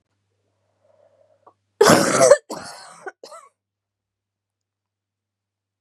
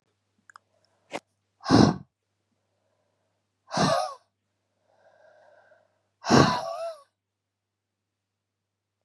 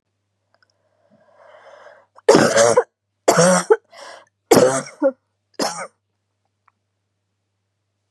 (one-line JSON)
{"cough_length": "5.8 s", "cough_amplitude": 32768, "cough_signal_mean_std_ratio": 0.25, "exhalation_length": "9.0 s", "exhalation_amplitude": 27805, "exhalation_signal_mean_std_ratio": 0.26, "three_cough_length": "8.1 s", "three_cough_amplitude": 32768, "three_cough_signal_mean_std_ratio": 0.34, "survey_phase": "beta (2021-08-13 to 2022-03-07)", "age": "18-44", "gender": "Female", "wearing_mask": "No", "symptom_cough_any": true, "symptom_runny_or_blocked_nose": true, "symptom_sore_throat": true, "symptom_fatigue": true, "symptom_headache": true, "symptom_change_to_sense_of_smell_or_taste": true, "symptom_loss_of_taste": true, "symptom_onset": "4 days", "smoker_status": "Never smoked", "respiratory_condition_asthma": true, "respiratory_condition_other": false, "recruitment_source": "Test and Trace", "submission_delay": "2 days", "covid_test_result": "Positive", "covid_test_method": "RT-qPCR", "covid_ct_value": 22.1, "covid_ct_gene": "ORF1ab gene", "covid_ct_mean": 22.5, "covid_viral_load": "40000 copies/ml", "covid_viral_load_category": "Low viral load (10K-1M copies/ml)"}